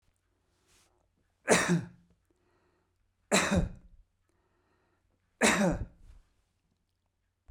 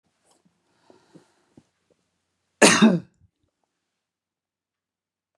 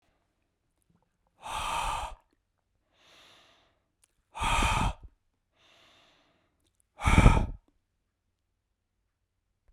{"three_cough_length": "7.5 s", "three_cough_amplitude": 12909, "three_cough_signal_mean_std_ratio": 0.31, "cough_length": "5.4 s", "cough_amplitude": 31946, "cough_signal_mean_std_ratio": 0.2, "exhalation_length": "9.7 s", "exhalation_amplitude": 19854, "exhalation_signal_mean_std_ratio": 0.28, "survey_phase": "beta (2021-08-13 to 2022-03-07)", "age": "65+", "gender": "Male", "wearing_mask": "No", "symptom_none": true, "smoker_status": "Never smoked", "respiratory_condition_asthma": false, "respiratory_condition_other": false, "recruitment_source": "REACT", "submission_delay": "2 days", "covid_test_result": "Negative", "covid_test_method": "RT-qPCR", "influenza_a_test_result": "Negative", "influenza_b_test_result": "Negative"}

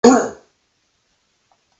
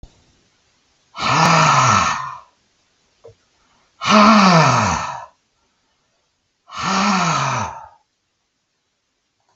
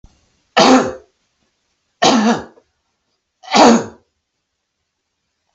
{"cough_length": "1.8 s", "cough_amplitude": 32768, "cough_signal_mean_std_ratio": 0.27, "exhalation_length": "9.6 s", "exhalation_amplitude": 32768, "exhalation_signal_mean_std_ratio": 0.47, "three_cough_length": "5.5 s", "three_cough_amplitude": 32768, "three_cough_signal_mean_std_ratio": 0.35, "survey_phase": "beta (2021-08-13 to 2022-03-07)", "age": "65+", "gender": "Male", "wearing_mask": "No", "symptom_none": true, "smoker_status": "Never smoked", "respiratory_condition_asthma": false, "respiratory_condition_other": false, "recruitment_source": "REACT", "submission_delay": "1 day", "covid_test_result": "Negative", "covid_test_method": "RT-qPCR", "influenza_a_test_result": "Negative", "influenza_b_test_result": "Negative"}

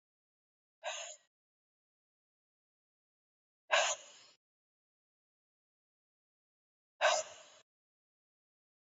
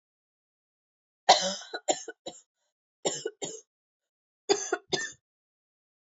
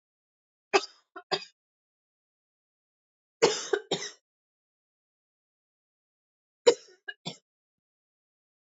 {"exhalation_length": "9.0 s", "exhalation_amplitude": 5619, "exhalation_signal_mean_std_ratio": 0.21, "cough_length": "6.1 s", "cough_amplitude": 19822, "cough_signal_mean_std_ratio": 0.27, "three_cough_length": "8.8 s", "three_cough_amplitude": 15950, "three_cough_signal_mean_std_ratio": 0.18, "survey_phase": "beta (2021-08-13 to 2022-03-07)", "age": "18-44", "gender": "Female", "wearing_mask": "No", "symptom_cough_any": true, "symptom_runny_or_blocked_nose": true, "symptom_headache": true, "smoker_status": "Never smoked", "respiratory_condition_asthma": false, "respiratory_condition_other": false, "recruitment_source": "Test and Trace", "submission_delay": "2 days", "covid_test_result": "Positive", "covid_test_method": "RT-qPCR", "covid_ct_value": 20.6, "covid_ct_gene": "ORF1ab gene"}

